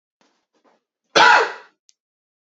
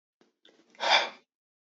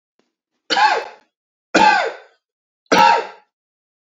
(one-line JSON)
{"cough_length": "2.6 s", "cough_amplitude": 30429, "cough_signal_mean_std_ratio": 0.29, "exhalation_length": "1.8 s", "exhalation_amplitude": 13160, "exhalation_signal_mean_std_ratio": 0.29, "three_cough_length": "4.0 s", "three_cough_amplitude": 28461, "three_cough_signal_mean_std_ratio": 0.41, "survey_phase": "beta (2021-08-13 to 2022-03-07)", "age": "18-44", "gender": "Male", "wearing_mask": "No", "symptom_cough_any": true, "symptom_runny_or_blocked_nose": true, "symptom_fatigue": true, "symptom_headache": true, "smoker_status": "Never smoked", "respiratory_condition_asthma": false, "respiratory_condition_other": false, "recruitment_source": "Test and Trace", "submission_delay": "2 days", "covid_test_result": "Positive", "covid_test_method": "RT-qPCR"}